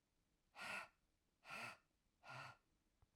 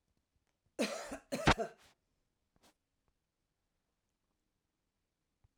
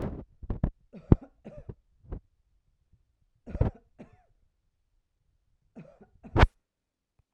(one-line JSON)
{"exhalation_length": "3.2 s", "exhalation_amplitude": 413, "exhalation_signal_mean_std_ratio": 0.46, "cough_length": "5.6 s", "cough_amplitude": 6530, "cough_signal_mean_std_ratio": 0.21, "three_cough_length": "7.3 s", "three_cough_amplitude": 24772, "three_cough_signal_mean_std_ratio": 0.2, "survey_phase": "beta (2021-08-13 to 2022-03-07)", "age": "45-64", "gender": "Female", "wearing_mask": "No", "symptom_none": true, "smoker_status": "Current smoker (e-cigarettes or vapes only)", "respiratory_condition_asthma": false, "respiratory_condition_other": false, "recruitment_source": "REACT", "submission_delay": "1 day", "covid_test_result": "Negative", "covid_test_method": "RT-qPCR"}